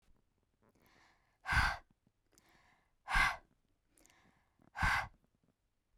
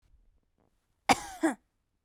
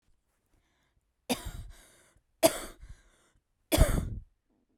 {"exhalation_length": "6.0 s", "exhalation_amplitude": 4847, "exhalation_signal_mean_std_ratio": 0.3, "cough_length": "2.0 s", "cough_amplitude": 14257, "cough_signal_mean_std_ratio": 0.24, "three_cough_length": "4.8 s", "three_cough_amplitude": 14771, "three_cough_signal_mean_std_ratio": 0.28, "survey_phase": "beta (2021-08-13 to 2022-03-07)", "age": "18-44", "gender": "Female", "wearing_mask": "No", "symptom_cough_any": true, "symptom_fatigue": true, "symptom_onset": "2 days", "smoker_status": "Never smoked", "respiratory_condition_asthma": false, "respiratory_condition_other": false, "recruitment_source": "Test and Trace", "submission_delay": "0 days", "covid_test_result": "Negative", "covid_test_method": "LAMP"}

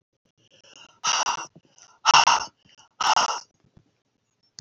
{"exhalation_length": "4.6 s", "exhalation_amplitude": 25855, "exhalation_signal_mean_std_ratio": 0.35, "survey_phase": "beta (2021-08-13 to 2022-03-07)", "age": "65+", "gender": "Female", "wearing_mask": "No", "symptom_none": true, "smoker_status": "Ex-smoker", "respiratory_condition_asthma": true, "respiratory_condition_other": true, "recruitment_source": "REACT", "submission_delay": "1 day", "covid_test_result": "Negative", "covid_test_method": "RT-qPCR", "influenza_a_test_result": "Negative", "influenza_b_test_result": "Negative"}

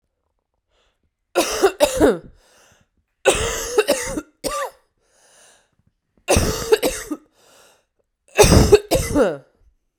{"three_cough_length": "10.0 s", "three_cough_amplitude": 32768, "three_cough_signal_mean_std_ratio": 0.41, "survey_phase": "beta (2021-08-13 to 2022-03-07)", "age": "18-44", "gender": "Female", "wearing_mask": "No", "symptom_cough_any": true, "symptom_new_continuous_cough": true, "symptom_runny_or_blocked_nose": true, "symptom_shortness_of_breath": true, "symptom_sore_throat": true, "symptom_fatigue": true, "symptom_fever_high_temperature": true, "symptom_headache": true, "symptom_change_to_sense_of_smell_or_taste": true, "symptom_onset": "2 days", "smoker_status": "Current smoker (e-cigarettes or vapes only)", "respiratory_condition_asthma": true, "respiratory_condition_other": false, "recruitment_source": "Test and Trace", "submission_delay": "2 days", "covid_test_result": "Positive", "covid_test_method": "RT-qPCR", "covid_ct_value": 17.2, "covid_ct_gene": "ORF1ab gene", "covid_ct_mean": 17.8, "covid_viral_load": "1400000 copies/ml", "covid_viral_load_category": "High viral load (>1M copies/ml)"}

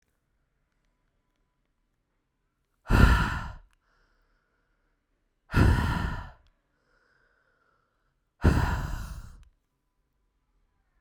{"exhalation_length": "11.0 s", "exhalation_amplitude": 20699, "exhalation_signal_mean_std_ratio": 0.3, "survey_phase": "beta (2021-08-13 to 2022-03-07)", "age": "18-44", "gender": "Female", "wearing_mask": "No", "symptom_runny_or_blocked_nose": true, "symptom_headache": true, "smoker_status": "Never smoked", "respiratory_condition_asthma": true, "respiratory_condition_other": false, "recruitment_source": "Test and Trace", "submission_delay": "2 days", "covid_test_result": "Positive", "covid_test_method": "RT-qPCR"}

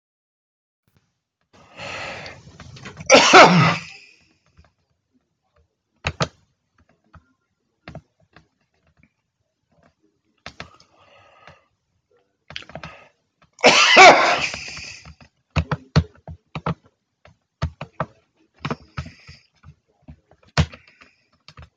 {"cough_length": "21.8 s", "cough_amplitude": 32767, "cough_signal_mean_std_ratio": 0.25, "survey_phase": "alpha (2021-03-01 to 2021-08-12)", "age": "65+", "gender": "Male", "wearing_mask": "No", "symptom_none": true, "smoker_status": "Never smoked", "respiratory_condition_asthma": false, "respiratory_condition_other": false, "recruitment_source": "REACT", "submission_delay": "1 day", "covid_test_result": "Negative", "covid_test_method": "RT-qPCR"}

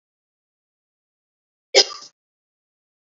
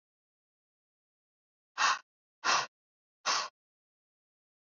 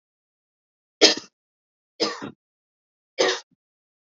{"cough_length": "3.2 s", "cough_amplitude": 30418, "cough_signal_mean_std_ratio": 0.14, "exhalation_length": "4.7 s", "exhalation_amplitude": 6980, "exhalation_signal_mean_std_ratio": 0.28, "three_cough_length": "4.2 s", "three_cough_amplitude": 28657, "three_cough_signal_mean_std_ratio": 0.24, "survey_phase": "beta (2021-08-13 to 2022-03-07)", "age": "18-44", "gender": "Female", "wearing_mask": "No", "symptom_fatigue": true, "symptom_onset": "12 days", "smoker_status": "Never smoked", "respiratory_condition_asthma": false, "respiratory_condition_other": false, "recruitment_source": "REACT", "submission_delay": "2 days", "covid_test_result": "Negative", "covid_test_method": "RT-qPCR", "influenza_a_test_result": "Negative", "influenza_b_test_result": "Negative"}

